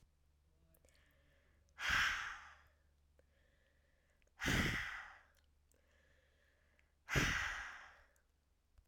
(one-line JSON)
{"exhalation_length": "8.9 s", "exhalation_amplitude": 2525, "exhalation_signal_mean_std_ratio": 0.38, "survey_phase": "alpha (2021-03-01 to 2021-08-12)", "age": "18-44", "gender": "Female", "wearing_mask": "No", "symptom_none": true, "smoker_status": "Current smoker (1 to 10 cigarettes per day)", "respiratory_condition_asthma": false, "respiratory_condition_other": false, "recruitment_source": "REACT", "submission_delay": "1 day", "covid_test_result": "Negative", "covid_test_method": "RT-qPCR"}